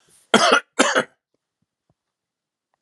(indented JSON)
{
  "cough_length": "2.8 s",
  "cough_amplitude": 32488,
  "cough_signal_mean_std_ratio": 0.32,
  "survey_phase": "alpha (2021-03-01 to 2021-08-12)",
  "age": "45-64",
  "gender": "Male",
  "wearing_mask": "No",
  "symptom_none": true,
  "smoker_status": "Ex-smoker",
  "respiratory_condition_asthma": false,
  "respiratory_condition_other": false,
  "recruitment_source": "REACT",
  "submission_delay": "2 days",
  "covid_test_result": "Negative",
  "covid_test_method": "RT-qPCR"
}